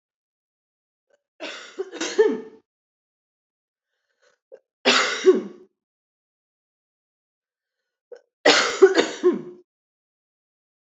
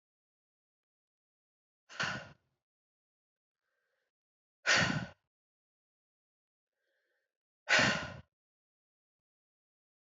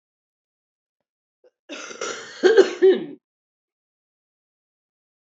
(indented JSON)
{
  "three_cough_length": "10.8 s",
  "three_cough_amplitude": 26361,
  "three_cough_signal_mean_std_ratio": 0.29,
  "exhalation_length": "10.2 s",
  "exhalation_amplitude": 5712,
  "exhalation_signal_mean_std_ratio": 0.23,
  "cough_length": "5.4 s",
  "cough_amplitude": 26533,
  "cough_signal_mean_std_ratio": 0.26,
  "survey_phase": "beta (2021-08-13 to 2022-03-07)",
  "age": "45-64",
  "gender": "Female",
  "wearing_mask": "No",
  "symptom_cough_any": true,
  "symptom_runny_or_blocked_nose": true,
  "symptom_shortness_of_breath": true,
  "symptom_sore_throat": true,
  "symptom_headache": true,
  "smoker_status": "Never smoked",
  "respiratory_condition_asthma": false,
  "respiratory_condition_other": false,
  "recruitment_source": "Test and Trace",
  "submission_delay": "4 days",
  "covid_test_method": "RT-qPCR",
  "covid_ct_value": 34.8,
  "covid_ct_gene": "N gene",
  "covid_ct_mean": 35.0,
  "covid_viral_load": "3.4 copies/ml",
  "covid_viral_load_category": "Minimal viral load (< 10K copies/ml)"
}